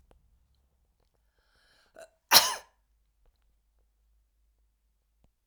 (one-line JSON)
{"cough_length": "5.5 s", "cough_amplitude": 27015, "cough_signal_mean_std_ratio": 0.15, "survey_phase": "alpha (2021-03-01 to 2021-08-12)", "age": "65+", "gender": "Female", "wearing_mask": "No", "symptom_none": true, "smoker_status": "Ex-smoker", "respiratory_condition_asthma": false, "respiratory_condition_other": false, "recruitment_source": "REACT", "submission_delay": "1 day", "covid_test_result": "Negative", "covid_test_method": "RT-qPCR"}